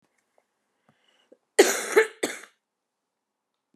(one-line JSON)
{"cough_length": "3.8 s", "cough_amplitude": 23752, "cough_signal_mean_std_ratio": 0.24, "survey_phase": "beta (2021-08-13 to 2022-03-07)", "age": "45-64", "gender": "Female", "wearing_mask": "Yes", "symptom_cough_any": true, "symptom_runny_or_blocked_nose": true, "symptom_fever_high_temperature": true, "symptom_headache": true, "smoker_status": "Ex-smoker", "respiratory_condition_asthma": false, "respiratory_condition_other": false, "recruitment_source": "Test and Trace", "submission_delay": "1 day", "covid_test_result": "Positive", "covid_test_method": "RT-qPCR", "covid_ct_value": 23.2, "covid_ct_gene": "ORF1ab gene", "covid_ct_mean": 23.6, "covid_viral_load": "17000 copies/ml", "covid_viral_load_category": "Low viral load (10K-1M copies/ml)"}